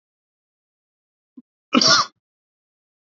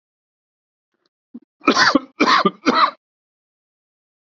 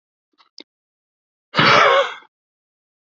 {"cough_length": "3.2 s", "cough_amplitude": 28676, "cough_signal_mean_std_ratio": 0.24, "three_cough_length": "4.3 s", "three_cough_amplitude": 29129, "three_cough_signal_mean_std_ratio": 0.35, "exhalation_length": "3.1 s", "exhalation_amplitude": 27261, "exhalation_signal_mean_std_ratio": 0.34, "survey_phase": "beta (2021-08-13 to 2022-03-07)", "age": "45-64", "gender": "Male", "wearing_mask": "No", "symptom_none": true, "smoker_status": "Never smoked", "respiratory_condition_asthma": false, "respiratory_condition_other": false, "recruitment_source": "REACT", "submission_delay": "4 days", "covid_test_result": "Negative", "covid_test_method": "RT-qPCR", "influenza_a_test_result": "Negative", "influenza_b_test_result": "Negative"}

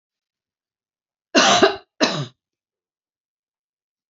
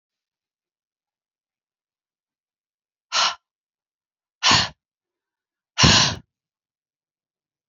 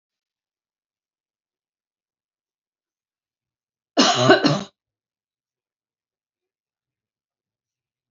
{"cough_length": "4.1 s", "cough_amplitude": 27915, "cough_signal_mean_std_ratio": 0.29, "exhalation_length": "7.7 s", "exhalation_amplitude": 29485, "exhalation_signal_mean_std_ratio": 0.24, "three_cough_length": "8.1 s", "three_cough_amplitude": 27897, "three_cough_signal_mean_std_ratio": 0.2, "survey_phase": "beta (2021-08-13 to 2022-03-07)", "age": "45-64", "gender": "Female", "wearing_mask": "No", "symptom_cough_any": true, "symptom_new_continuous_cough": true, "symptom_runny_or_blocked_nose": true, "symptom_sore_throat": true, "symptom_fatigue": true, "symptom_headache": true, "symptom_onset": "8 days", "smoker_status": "Never smoked", "respiratory_condition_asthma": false, "respiratory_condition_other": false, "recruitment_source": "Test and Trace", "submission_delay": "1 day", "covid_test_result": "Positive", "covid_test_method": "RT-qPCR", "covid_ct_value": 23.6, "covid_ct_gene": "ORF1ab gene", "covid_ct_mean": 24.7, "covid_viral_load": "8200 copies/ml", "covid_viral_load_category": "Minimal viral load (< 10K copies/ml)"}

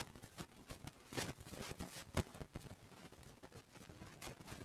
{"cough_length": "4.6 s", "cough_amplitude": 2532, "cough_signal_mean_std_ratio": 0.56, "survey_phase": "beta (2021-08-13 to 2022-03-07)", "age": "65+", "gender": "Male", "wearing_mask": "No", "symptom_none": true, "smoker_status": "Ex-smoker", "respiratory_condition_asthma": false, "respiratory_condition_other": false, "recruitment_source": "REACT", "submission_delay": "4 days", "covid_test_result": "Negative", "covid_test_method": "RT-qPCR", "influenza_a_test_result": "Negative", "influenza_b_test_result": "Negative"}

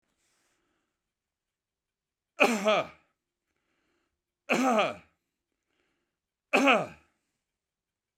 {"three_cough_length": "8.2 s", "three_cough_amplitude": 16256, "three_cough_signal_mean_std_ratio": 0.3, "survey_phase": "beta (2021-08-13 to 2022-03-07)", "age": "65+", "gender": "Male", "wearing_mask": "No", "symptom_none": true, "smoker_status": "Ex-smoker", "respiratory_condition_asthma": false, "respiratory_condition_other": false, "recruitment_source": "REACT", "submission_delay": "2 days", "covid_test_result": "Negative", "covid_test_method": "RT-qPCR"}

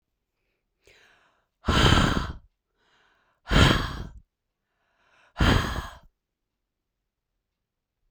{"exhalation_length": "8.1 s", "exhalation_amplitude": 19830, "exhalation_signal_mean_std_ratio": 0.33, "survey_phase": "beta (2021-08-13 to 2022-03-07)", "age": "45-64", "gender": "Female", "wearing_mask": "No", "symptom_none": true, "smoker_status": "Never smoked", "respiratory_condition_asthma": false, "respiratory_condition_other": false, "recruitment_source": "REACT", "submission_delay": "1 day", "covid_test_result": "Negative", "covid_test_method": "RT-qPCR", "influenza_a_test_result": "Unknown/Void", "influenza_b_test_result": "Unknown/Void"}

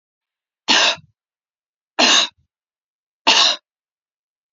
{"three_cough_length": "4.5 s", "three_cough_amplitude": 31577, "three_cough_signal_mean_std_ratio": 0.35, "survey_phase": "beta (2021-08-13 to 2022-03-07)", "age": "18-44", "gender": "Female", "wearing_mask": "No", "symptom_none": true, "smoker_status": "Never smoked", "respiratory_condition_asthma": false, "respiratory_condition_other": false, "recruitment_source": "REACT", "submission_delay": "1 day", "covid_test_result": "Negative", "covid_test_method": "RT-qPCR", "influenza_a_test_result": "Negative", "influenza_b_test_result": "Negative"}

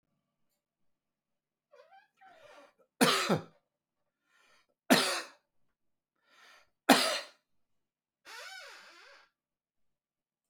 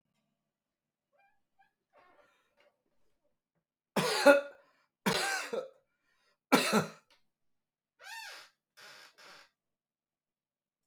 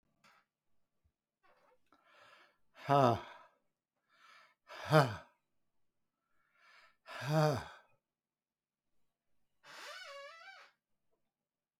{"three_cough_length": "10.5 s", "three_cough_amplitude": 18333, "three_cough_signal_mean_std_ratio": 0.24, "cough_length": "10.9 s", "cough_amplitude": 12314, "cough_signal_mean_std_ratio": 0.25, "exhalation_length": "11.8 s", "exhalation_amplitude": 9125, "exhalation_signal_mean_std_ratio": 0.23, "survey_phase": "alpha (2021-03-01 to 2021-08-12)", "age": "65+", "gender": "Male", "wearing_mask": "No", "symptom_none": true, "smoker_status": "Ex-smoker", "respiratory_condition_asthma": false, "respiratory_condition_other": false, "recruitment_source": "REACT", "submission_delay": "2 days", "covid_test_result": "Negative", "covid_test_method": "RT-qPCR"}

